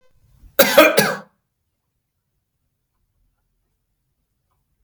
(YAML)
cough_length: 4.8 s
cough_amplitude: 32768
cough_signal_mean_std_ratio: 0.24
survey_phase: beta (2021-08-13 to 2022-03-07)
age: 65+
gender: Male
wearing_mask: 'No'
symptom_none: true
smoker_status: Ex-smoker
respiratory_condition_asthma: false
respiratory_condition_other: false
recruitment_source: REACT
submission_delay: 2 days
covid_test_result: Negative
covid_test_method: RT-qPCR
influenza_a_test_result: Negative
influenza_b_test_result: Negative